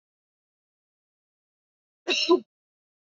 cough_length: 3.2 s
cough_amplitude: 11596
cough_signal_mean_std_ratio: 0.23
survey_phase: alpha (2021-03-01 to 2021-08-12)
age: 18-44
gender: Female
wearing_mask: 'No'
symptom_none: true
smoker_status: Never smoked
respiratory_condition_asthma: false
respiratory_condition_other: false
recruitment_source: REACT
submission_delay: 1 day
covid_test_result: Negative
covid_test_method: RT-qPCR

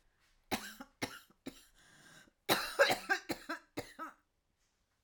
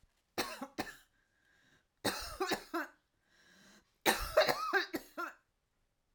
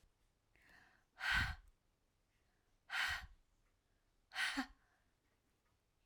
cough_length: 5.0 s
cough_amplitude: 7454
cough_signal_mean_std_ratio: 0.34
three_cough_length: 6.1 s
three_cough_amplitude: 8323
three_cough_signal_mean_std_ratio: 0.39
exhalation_length: 6.1 s
exhalation_amplitude: 1737
exhalation_signal_mean_std_ratio: 0.34
survey_phase: alpha (2021-03-01 to 2021-08-12)
age: 45-64
gender: Female
wearing_mask: 'No'
symptom_cough_any: true
symptom_new_continuous_cough: true
symptom_shortness_of_breath: true
symptom_fatigue: true
symptom_headache: true
symptom_onset: 3 days
smoker_status: Prefer not to say
respiratory_condition_asthma: false
respiratory_condition_other: false
recruitment_source: Test and Trace
submission_delay: 2 days
covid_test_result: Positive
covid_test_method: RT-qPCR
covid_ct_value: 19.0
covid_ct_gene: ORF1ab gene
covid_ct_mean: 19.4
covid_viral_load: 420000 copies/ml
covid_viral_load_category: Low viral load (10K-1M copies/ml)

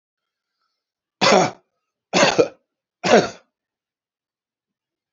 cough_length: 5.1 s
cough_amplitude: 28327
cough_signal_mean_std_ratio: 0.31
survey_phase: beta (2021-08-13 to 2022-03-07)
age: 45-64
gender: Male
wearing_mask: 'No'
symptom_runny_or_blocked_nose: true
symptom_sore_throat: true
smoker_status: Ex-smoker
respiratory_condition_asthma: false
respiratory_condition_other: false
recruitment_source: REACT
submission_delay: 1 day
covid_test_result: Negative
covid_test_method: RT-qPCR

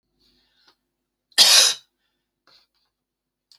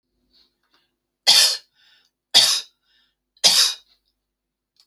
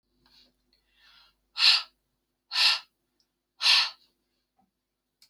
cough_length: 3.6 s
cough_amplitude: 32768
cough_signal_mean_std_ratio: 0.25
three_cough_length: 4.9 s
three_cough_amplitude: 32768
three_cough_signal_mean_std_ratio: 0.32
exhalation_length: 5.3 s
exhalation_amplitude: 14397
exhalation_signal_mean_std_ratio: 0.3
survey_phase: alpha (2021-03-01 to 2021-08-12)
age: 45-64
gender: Female
wearing_mask: 'No'
symptom_none: true
symptom_onset: 10 days
smoker_status: Never smoked
respiratory_condition_asthma: false
respiratory_condition_other: false
recruitment_source: REACT
submission_delay: 1 day
covid_test_result: Negative
covid_test_method: RT-qPCR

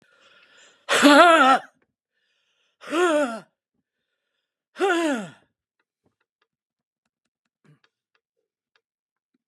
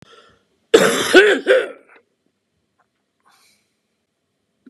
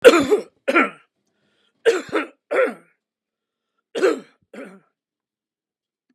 exhalation_length: 9.5 s
exhalation_amplitude: 31149
exhalation_signal_mean_std_ratio: 0.31
cough_length: 4.7 s
cough_amplitude: 32768
cough_signal_mean_std_ratio: 0.32
three_cough_length: 6.1 s
three_cough_amplitude: 32768
three_cough_signal_mean_std_ratio: 0.32
survey_phase: beta (2021-08-13 to 2022-03-07)
age: 65+
gender: Male
wearing_mask: 'No'
symptom_none: true
smoker_status: Prefer not to say
respiratory_condition_asthma: false
respiratory_condition_other: false
recruitment_source: REACT
submission_delay: 7 days
covid_test_result: Negative
covid_test_method: RT-qPCR
influenza_a_test_result: Negative
influenza_b_test_result: Negative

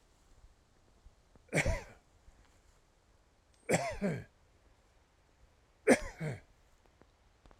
three_cough_length: 7.6 s
three_cough_amplitude: 9869
three_cough_signal_mean_std_ratio: 0.29
survey_phase: alpha (2021-03-01 to 2021-08-12)
age: 65+
gender: Male
wearing_mask: 'No'
symptom_none: true
smoker_status: Never smoked
respiratory_condition_asthma: false
respiratory_condition_other: false
recruitment_source: REACT
submission_delay: 1 day
covid_test_result: Negative
covid_test_method: RT-qPCR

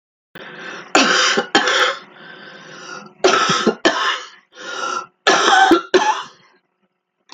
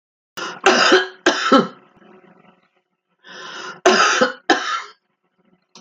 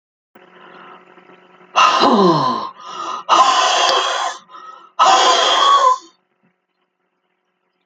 three_cough_length: 7.3 s
three_cough_amplitude: 32768
three_cough_signal_mean_std_ratio: 0.55
cough_length: 5.8 s
cough_amplitude: 32767
cough_signal_mean_std_ratio: 0.43
exhalation_length: 7.9 s
exhalation_amplitude: 32768
exhalation_signal_mean_std_ratio: 0.56
survey_phase: alpha (2021-03-01 to 2021-08-12)
age: 65+
gender: Female
wearing_mask: 'No'
symptom_none: true
smoker_status: Ex-smoker
respiratory_condition_asthma: false
respiratory_condition_other: true
recruitment_source: REACT
submission_delay: 2 days
covid_test_result: Negative
covid_test_method: RT-qPCR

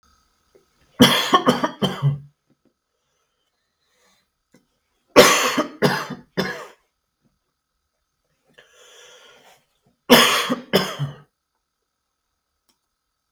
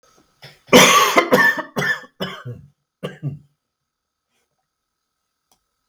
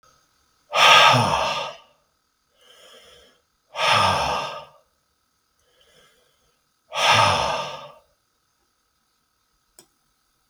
three_cough_length: 13.3 s
three_cough_amplitude: 32768
three_cough_signal_mean_std_ratio: 0.31
cough_length: 5.9 s
cough_amplitude: 32768
cough_signal_mean_std_ratio: 0.35
exhalation_length: 10.5 s
exhalation_amplitude: 32766
exhalation_signal_mean_std_ratio: 0.37
survey_phase: beta (2021-08-13 to 2022-03-07)
age: 45-64
gender: Male
wearing_mask: 'No'
symptom_cough_any: true
symptom_runny_or_blocked_nose: true
symptom_sore_throat: true
symptom_onset: 5 days
smoker_status: Never smoked
respiratory_condition_asthma: true
respiratory_condition_other: false
recruitment_source: Test and Trace
submission_delay: 1 day
covid_test_result: Positive
covid_test_method: ePCR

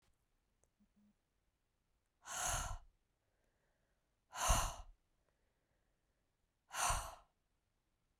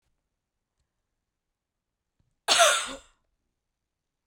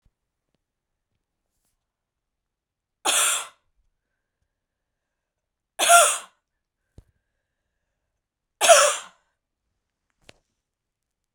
exhalation_length: 8.2 s
exhalation_amplitude: 3112
exhalation_signal_mean_std_ratio: 0.31
cough_length: 4.3 s
cough_amplitude: 16403
cough_signal_mean_std_ratio: 0.23
three_cough_length: 11.3 s
three_cough_amplitude: 32767
three_cough_signal_mean_std_ratio: 0.23
survey_phase: beta (2021-08-13 to 2022-03-07)
age: 45-64
gender: Female
wearing_mask: 'No'
symptom_cough_any: true
symptom_runny_or_blocked_nose: true
symptom_headache: true
smoker_status: Never smoked
respiratory_condition_asthma: true
respiratory_condition_other: false
recruitment_source: Test and Trace
submission_delay: 2 days
covid_test_result: Positive
covid_test_method: RT-qPCR
covid_ct_value: 32.0
covid_ct_gene: ORF1ab gene
covid_ct_mean: 32.8
covid_viral_load: 18 copies/ml
covid_viral_load_category: Minimal viral load (< 10K copies/ml)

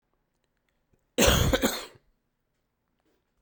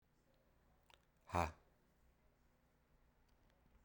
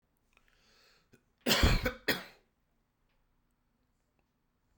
cough_length: 3.4 s
cough_amplitude: 16276
cough_signal_mean_std_ratio: 0.32
exhalation_length: 3.8 s
exhalation_amplitude: 2509
exhalation_signal_mean_std_ratio: 0.21
three_cough_length: 4.8 s
three_cough_amplitude: 7480
three_cough_signal_mean_std_ratio: 0.27
survey_phase: beta (2021-08-13 to 2022-03-07)
age: 45-64
gender: Male
wearing_mask: 'No'
symptom_cough_any: true
symptom_runny_or_blocked_nose: true
symptom_sore_throat: true
symptom_fever_high_temperature: true
symptom_change_to_sense_of_smell_or_taste: true
symptom_other: true
symptom_onset: 4 days
smoker_status: Ex-smoker
respiratory_condition_asthma: false
respiratory_condition_other: false
recruitment_source: Test and Trace
submission_delay: 2 days
covid_test_result: Positive
covid_test_method: RT-qPCR
covid_ct_value: 11.6
covid_ct_gene: ORF1ab gene
covid_ct_mean: 11.9
covid_viral_load: 120000000 copies/ml
covid_viral_load_category: High viral load (>1M copies/ml)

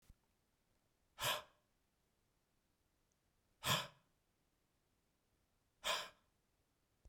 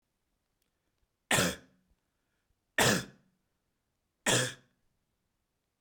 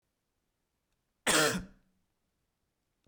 exhalation_length: 7.1 s
exhalation_amplitude: 2024
exhalation_signal_mean_std_ratio: 0.25
three_cough_length: 5.8 s
three_cough_amplitude: 8450
three_cough_signal_mean_std_ratio: 0.28
cough_length: 3.1 s
cough_amplitude: 8075
cough_signal_mean_std_ratio: 0.27
survey_phase: beta (2021-08-13 to 2022-03-07)
age: 45-64
gender: Male
wearing_mask: 'No'
symptom_cough_any: true
symptom_runny_or_blocked_nose: true
smoker_status: Ex-smoker
respiratory_condition_asthma: false
respiratory_condition_other: false
recruitment_source: Test and Trace
submission_delay: 1 day
covid_test_result: Positive
covid_test_method: LFT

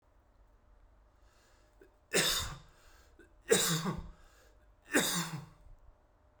three_cough_length: 6.4 s
three_cough_amplitude: 7945
three_cough_signal_mean_std_ratio: 0.39
survey_phase: beta (2021-08-13 to 2022-03-07)
age: 18-44
gender: Male
wearing_mask: 'No'
symptom_cough_any: true
symptom_new_continuous_cough: true
symptom_sore_throat: true
symptom_headache: true
symptom_onset: 3 days
smoker_status: Never smoked
respiratory_condition_asthma: false
respiratory_condition_other: false
recruitment_source: Test and Trace
submission_delay: 2 days
covid_test_result: Positive
covid_test_method: RT-qPCR
covid_ct_value: 29.4
covid_ct_gene: N gene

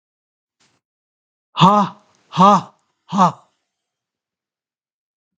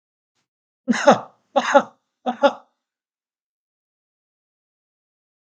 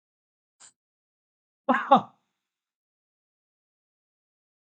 exhalation_length: 5.4 s
exhalation_amplitude: 32768
exhalation_signal_mean_std_ratio: 0.29
three_cough_length: 5.5 s
three_cough_amplitude: 32768
three_cough_signal_mean_std_ratio: 0.24
cough_length: 4.6 s
cough_amplitude: 20438
cough_signal_mean_std_ratio: 0.16
survey_phase: beta (2021-08-13 to 2022-03-07)
age: 65+
gender: Male
wearing_mask: 'No'
symptom_none: true
smoker_status: Never smoked
respiratory_condition_asthma: false
respiratory_condition_other: false
recruitment_source: REACT
submission_delay: 1 day
covid_test_result: Negative
covid_test_method: RT-qPCR
influenza_a_test_result: Negative
influenza_b_test_result: Negative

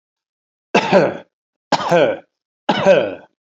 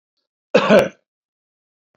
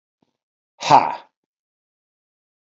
three_cough_length: 3.5 s
three_cough_amplitude: 27939
three_cough_signal_mean_std_ratio: 0.46
cough_length: 2.0 s
cough_amplitude: 27963
cough_signal_mean_std_ratio: 0.31
exhalation_length: 2.6 s
exhalation_amplitude: 26986
exhalation_signal_mean_std_ratio: 0.22
survey_phase: beta (2021-08-13 to 2022-03-07)
age: 45-64
gender: Male
wearing_mask: 'No'
symptom_none: true
smoker_status: Never smoked
respiratory_condition_asthma: false
respiratory_condition_other: false
recruitment_source: REACT
submission_delay: 8 days
covid_test_result: Negative
covid_test_method: RT-qPCR
influenza_a_test_result: Negative
influenza_b_test_result: Negative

